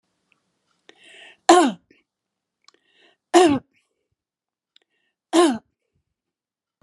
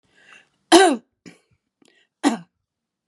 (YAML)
three_cough_length: 6.8 s
three_cough_amplitude: 31475
three_cough_signal_mean_std_ratio: 0.25
cough_length: 3.1 s
cough_amplitude: 32767
cough_signal_mean_std_ratio: 0.26
survey_phase: beta (2021-08-13 to 2022-03-07)
age: 65+
gender: Female
wearing_mask: 'No'
symptom_none: true
smoker_status: Ex-smoker
respiratory_condition_asthma: false
respiratory_condition_other: false
recruitment_source: REACT
submission_delay: 1 day
covid_test_result: Negative
covid_test_method: RT-qPCR
influenza_a_test_result: Unknown/Void
influenza_b_test_result: Unknown/Void